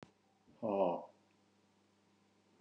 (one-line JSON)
{"exhalation_length": "2.6 s", "exhalation_amplitude": 3377, "exhalation_signal_mean_std_ratio": 0.32, "survey_phase": "beta (2021-08-13 to 2022-03-07)", "age": "45-64", "gender": "Male", "wearing_mask": "No", "symptom_none": true, "smoker_status": "Ex-smoker", "respiratory_condition_asthma": false, "respiratory_condition_other": false, "recruitment_source": "REACT", "submission_delay": "1 day", "covid_test_result": "Negative", "covid_test_method": "RT-qPCR"}